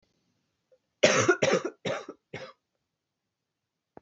{"cough_length": "4.0 s", "cough_amplitude": 16452, "cough_signal_mean_std_ratio": 0.33, "survey_phase": "beta (2021-08-13 to 2022-03-07)", "age": "18-44", "gender": "Female", "wearing_mask": "No", "symptom_cough_any": true, "symptom_runny_or_blocked_nose": true, "symptom_sore_throat": true, "symptom_fatigue": true, "symptom_change_to_sense_of_smell_or_taste": true, "symptom_onset": "2 days", "smoker_status": "Current smoker (11 or more cigarettes per day)", "respiratory_condition_asthma": false, "respiratory_condition_other": false, "recruitment_source": "Test and Trace", "submission_delay": "1 day", "covid_test_result": "Positive", "covid_test_method": "RT-qPCR", "covid_ct_value": 13.9, "covid_ct_gene": "ORF1ab gene"}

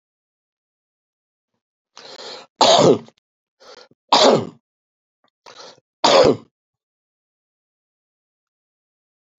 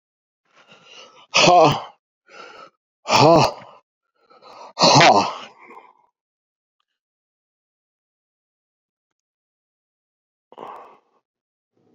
{"three_cough_length": "9.4 s", "three_cough_amplitude": 31465, "three_cough_signal_mean_std_ratio": 0.27, "exhalation_length": "11.9 s", "exhalation_amplitude": 30024, "exhalation_signal_mean_std_ratio": 0.28, "survey_phase": "beta (2021-08-13 to 2022-03-07)", "age": "65+", "gender": "Male", "wearing_mask": "Yes", "symptom_cough_any": true, "symptom_sore_throat": true, "symptom_abdominal_pain": true, "symptom_fever_high_temperature": true, "symptom_headache": true, "symptom_change_to_sense_of_smell_or_taste": true, "symptom_loss_of_taste": true, "symptom_onset": "4 days", "smoker_status": "Ex-smoker", "respiratory_condition_asthma": false, "respiratory_condition_other": false, "recruitment_source": "Test and Trace", "submission_delay": "2 days", "covid_test_result": "Positive", "covid_test_method": "RT-qPCR", "covid_ct_value": 15.3, "covid_ct_gene": "ORF1ab gene", "covid_ct_mean": 15.7, "covid_viral_load": "6900000 copies/ml", "covid_viral_load_category": "High viral load (>1M copies/ml)"}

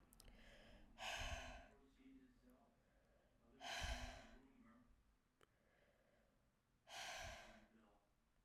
{"exhalation_length": "8.4 s", "exhalation_amplitude": 543, "exhalation_signal_mean_std_ratio": 0.5, "survey_phase": "beta (2021-08-13 to 2022-03-07)", "age": "18-44", "gender": "Female", "wearing_mask": "No", "symptom_cough_any": true, "symptom_runny_or_blocked_nose": true, "symptom_sore_throat": true, "symptom_fatigue": true, "symptom_headache": true, "symptom_change_to_sense_of_smell_or_taste": true, "symptom_loss_of_taste": true, "symptom_onset": "2 days", "smoker_status": "Never smoked", "respiratory_condition_asthma": false, "respiratory_condition_other": false, "recruitment_source": "Test and Trace", "submission_delay": "2 days", "covid_test_result": "Positive", "covid_test_method": "RT-qPCR", "covid_ct_value": 15.4, "covid_ct_gene": "ORF1ab gene", "covid_ct_mean": 15.9, "covid_viral_load": "5900000 copies/ml", "covid_viral_load_category": "High viral load (>1M copies/ml)"}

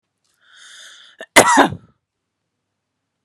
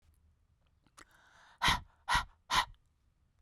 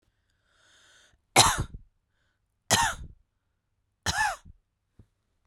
{"cough_length": "3.2 s", "cough_amplitude": 32768, "cough_signal_mean_std_ratio": 0.25, "exhalation_length": "3.4 s", "exhalation_amplitude": 5753, "exhalation_signal_mean_std_ratio": 0.31, "three_cough_length": "5.5 s", "three_cough_amplitude": 26980, "three_cough_signal_mean_std_ratio": 0.29, "survey_phase": "beta (2021-08-13 to 2022-03-07)", "age": "18-44", "gender": "Female", "wearing_mask": "No", "symptom_none": true, "smoker_status": "Ex-smoker", "respiratory_condition_asthma": false, "respiratory_condition_other": false, "recruitment_source": "REACT", "submission_delay": "3 days", "covid_test_result": "Negative", "covid_test_method": "RT-qPCR"}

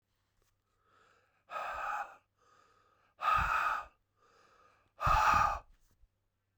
{"exhalation_length": "6.6 s", "exhalation_amplitude": 5027, "exhalation_signal_mean_std_ratio": 0.41, "survey_phase": "beta (2021-08-13 to 2022-03-07)", "age": "45-64", "gender": "Male", "wearing_mask": "No", "symptom_cough_any": true, "symptom_runny_or_blocked_nose": true, "symptom_fatigue": true, "symptom_fever_high_temperature": true, "symptom_headache": true, "symptom_change_to_sense_of_smell_or_taste": true, "smoker_status": "Never smoked", "respiratory_condition_asthma": false, "respiratory_condition_other": false, "recruitment_source": "Test and Trace", "submission_delay": "2 days", "covid_test_result": "Positive", "covid_test_method": "LFT"}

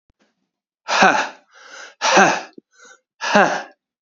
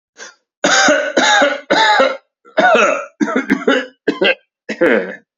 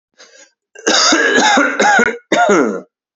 {"exhalation_length": "4.0 s", "exhalation_amplitude": 28145, "exhalation_signal_mean_std_ratio": 0.42, "three_cough_length": "5.4 s", "three_cough_amplitude": 32590, "three_cough_signal_mean_std_ratio": 0.66, "cough_length": "3.2 s", "cough_amplitude": 30145, "cough_signal_mean_std_ratio": 0.71, "survey_phase": "beta (2021-08-13 to 2022-03-07)", "age": "18-44", "gender": "Male", "wearing_mask": "No", "symptom_none": true, "smoker_status": "Current smoker (e-cigarettes or vapes only)", "respiratory_condition_asthma": false, "respiratory_condition_other": false, "recruitment_source": "REACT", "submission_delay": "0 days", "covid_test_result": "Negative", "covid_test_method": "RT-qPCR"}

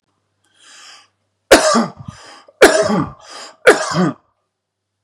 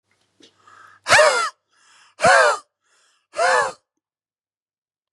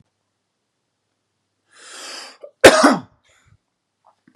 {"three_cough_length": "5.0 s", "three_cough_amplitude": 32768, "three_cough_signal_mean_std_ratio": 0.38, "exhalation_length": "5.1 s", "exhalation_amplitude": 32140, "exhalation_signal_mean_std_ratio": 0.37, "cough_length": "4.4 s", "cough_amplitude": 32768, "cough_signal_mean_std_ratio": 0.22, "survey_phase": "beta (2021-08-13 to 2022-03-07)", "age": "45-64", "gender": "Male", "wearing_mask": "No", "symptom_none": true, "smoker_status": "Never smoked", "respiratory_condition_asthma": false, "respiratory_condition_other": false, "recruitment_source": "REACT", "submission_delay": "1 day", "covid_test_result": "Negative", "covid_test_method": "RT-qPCR", "influenza_a_test_result": "Negative", "influenza_b_test_result": "Negative"}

